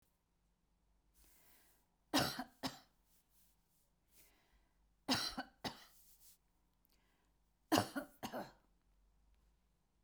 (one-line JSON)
{"three_cough_length": "10.0 s", "three_cough_amplitude": 5491, "three_cough_signal_mean_std_ratio": 0.27, "survey_phase": "beta (2021-08-13 to 2022-03-07)", "age": "65+", "gender": "Female", "wearing_mask": "No", "symptom_runny_or_blocked_nose": true, "smoker_status": "Never smoked", "respiratory_condition_asthma": false, "respiratory_condition_other": false, "recruitment_source": "REACT", "submission_delay": "1 day", "covid_test_result": "Negative", "covid_test_method": "RT-qPCR"}